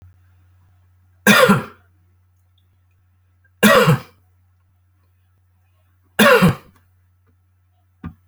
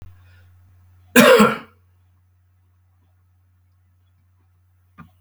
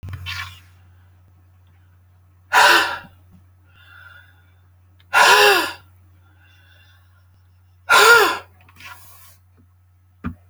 {"three_cough_length": "8.3 s", "three_cough_amplitude": 31569, "three_cough_signal_mean_std_ratio": 0.3, "cough_length": "5.2 s", "cough_amplitude": 32767, "cough_signal_mean_std_ratio": 0.24, "exhalation_length": "10.5 s", "exhalation_amplitude": 32768, "exhalation_signal_mean_std_ratio": 0.33, "survey_phase": "beta (2021-08-13 to 2022-03-07)", "age": "65+", "gender": "Male", "wearing_mask": "No", "symptom_none": true, "smoker_status": "Ex-smoker", "respiratory_condition_asthma": false, "respiratory_condition_other": false, "recruitment_source": "REACT", "submission_delay": "1 day", "covid_test_result": "Negative", "covid_test_method": "RT-qPCR"}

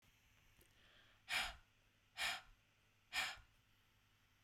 {"exhalation_length": "4.4 s", "exhalation_amplitude": 1307, "exhalation_signal_mean_std_ratio": 0.36, "survey_phase": "beta (2021-08-13 to 2022-03-07)", "age": "45-64", "gender": "Female", "wearing_mask": "No", "symptom_none": true, "smoker_status": "Never smoked", "respiratory_condition_asthma": true, "respiratory_condition_other": false, "recruitment_source": "REACT", "submission_delay": "4 days", "covid_test_result": "Negative", "covid_test_method": "RT-qPCR"}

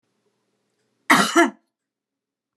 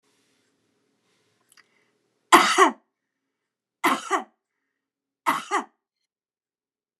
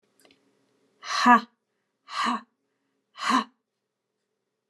{"cough_length": "2.6 s", "cough_amplitude": 28850, "cough_signal_mean_std_ratio": 0.28, "three_cough_length": "7.0 s", "three_cough_amplitude": 28605, "three_cough_signal_mean_std_ratio": 0.25, "exhalation_length": "4.7 s", "exhalation_amplitude": 18057, "exhalation_signal_mean_std_ratio": 0.29, "survey_phase": "beta (2021-08-13 to 2022-03-07)", "age": "65+", "gender": "Female", "wearing_mask": "No", "symptom_none": true, "smoker_status": "Never smoked", "respiratory_condition_asthma": false, "respiratory_condition_other": false, "recruitment_source": "REACT", "submission_delay": "2 days", "covid_test_result": "Negative", "covid_test_method": "RT-qPCR"}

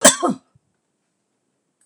{"cough_length": "1.9 s", "cough_amplitude": 26028, "cough_signal_mean_std_ratio": 0.25, "survey_phase": "beta (2021-08-13 to 2022-03-07)", "age": "65+", "gender": "Female", "wearing_mask": "No", "symptom_none": true, "smoker_status": "Never smoked", "respiratory_condition_asthma": false, "respiratory_condition_other": false, "recruitment_source": "REACT", "submission_delay": "2 days", "covid_test_result": "Negative", "covid_test_method": "RT-qPCR", "influenza_a_test_result": "Negative", "influenza_b_test_result": "Negative"}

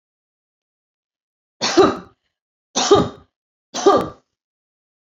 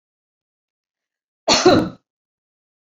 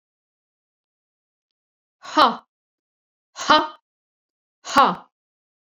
{"three_cough_length": "5.0 s", "three_cough_amplitude": 27589, "three_cough_signal_mean_std_ratio": 0.32, "cough_length": "2.9 s", "cough_amplitude": 29645, "cough_signal_mean_std_ratio": 0.28, "exhalation_length": "5.7 s", "exhalation_amplitude": 26656, "exhalation_signal_mean_std_ratio": 0.25, "survey_phase": "beta (2021-08-13 to 2022-03-07)", "age": "45-64", "gender": "Female", "wearing_mask": "No", "symptom_none": true, "smoker_status": "Never smoked", "respiratory_condition_asthma": false, "respiratory_condition_other": false, "recruitment_source": "REACT", "submission_delay": "1 day", "covid_test_result": "Negative", "covid_test_method": "RT-qPCR"}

